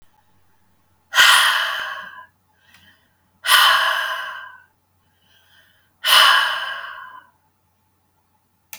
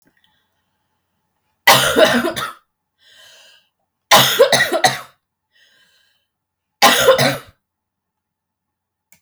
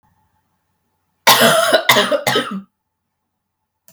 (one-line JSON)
{"exhalation_length": "8.8 s", "exhalation_amplitude": 32768, "exhalation_signal_mean_std_ratio": 0.4, "three_cough_length": "9.2 s", "three_cough_amplitude": 32768, "three_cough_signal_mean_std_ratio": 0.36, "cough_length": "3.9 s", "cough_amplitude": 32768, "cough_signal_mean_std_ratio": 0.43, "survey_phase": "beta (2021-08-13 to 2022-03-07)", "age": "18-44", "gender": "Female", "wearing_mask": "No", "symptom_sore_throat": true, "symptom_onset": "9 days", "smoker_status": "Ex-smoker", "respiratory_condition_asthma": false, "respiratory_condition_other": false, "recruitment_source": "REACT", "submission_delay": "8 days", "covid_test_result": "Negative", "covid_test_method": "RT-qPCR", "influenza_a_test_result": "Negative", "influenza_b_test_result": "Negative"}